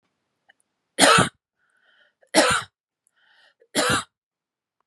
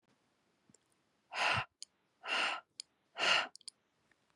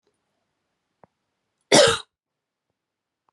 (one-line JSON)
{"three_cough_length": "4.9 s", "three_cough_amplitude": 31743, "three_cough_signal_mean_std_ratio": 0.32, "exhalation_length": "4.4 s", "exhalation_amplitude": 4363, "exhalation_signal_mean_std_ratio": 0.37, "cough_length": "3.3 s", "cough_amplitude": 30594, "cough_signal_mean_std_ratio": 0.21, "survey_phase": "beta (2021-08-13 to 2022-03-07)", "age": "18-44", "gender": "Female", "wearing_mask": "No", "symptom_none": true, "smoker_status": "Never smoked", "respiratory_condition_asthma": false, "respiratory_condition_other": false, "recruitment_source": "Test and Trace", "submission_delay": "0 days", "covid_test_result": "Negative", "covid_test_method": "LFT"}